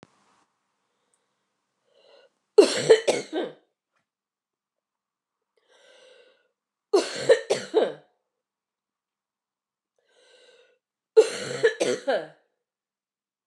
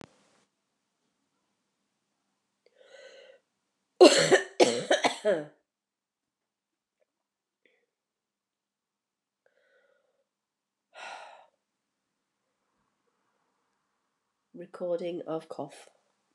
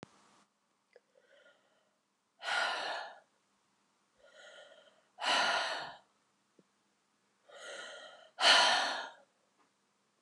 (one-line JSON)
{"three_cough_length": "13.5 s", "three_cough_amplitude": 24430, "three_cough_signal_mean_std_ratio": 0.26, "cough_length": "16.3 s", "cough_amplitude": 21102, "cough_signal_mean_std_ratio": 0.2, "exhalation_length": "10.2 s", "exhalation_amplitude": 8363, "exhalation_signal_mean_std_ratio": 0.34, "survey_phase": "beta (2021-08-13 to 2022-03-07)", "age": "45-64", "gender": "Female", "wearing_mask": "No", "symptom_cough_any": true, "symptom_runny_or_blocked_nose": true, "symptom_sore_throat": true, "symptom_change_to_sense_of_smell_or_taste": true, "symptom_onset": "5 days", "smoker_status": "Ex-smoker", "respiratory_condition_asthma": true, "respiratory_condition_other": false, "recruitment_source": "Test and Trace", "submission_delay": "2 days", "covid_test_result": "Positive", "covid_test_method": "RT-qPCR"}